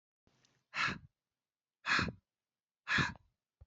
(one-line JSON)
{"exhalation_length": "3.7 s", "exhalation_amplitude": 4109, "exhalation_signal_mean_std_ratio": 0.35, "survey_phase": "beta (2021-08-13 to 2022-03-07)", "age": "18-44", "gender": "Male", "wearing_mask": "No", "symptom_cough_any": true, "symptom_new_continuous_cough": true, "symptom_sore_throat": true, "symptom_fatigue": true, "symptom_onset": "6 days", "smoker_status": "Never smoked", "respiratory_condition_asthma": true, "respiratory_condition_other": false, "recruitment_source": "Test and Trace", "submission_delay": "1 day", "covid_test_result": "Positive", "covid_test_method": "RT-qPCR", "covid_ct_value": 23.9, "covid_ct_gene": "ORF1ab gene"}